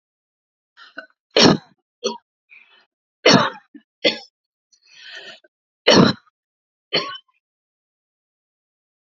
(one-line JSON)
{"three_cough_length": "9.1 s", "three_cough_amplitude": 32767, "three_cough_signal_mean_std_ratio": 0.26, "survey_phase": "alpha (2021-03-01 to 2021-08-12)", "age": "45-64", "gender": "Female", "wearing_mask": "No", "symptom_none": true, "smoker_status": "Never smoked", "respiratory_condition_asthma": false, "respiratory_condition_other": false, "recruitment_source": "REACT", "submission_delay": "3 days", "covid_test_result": "Negative", "covid_test_method": "RT-qPCR"}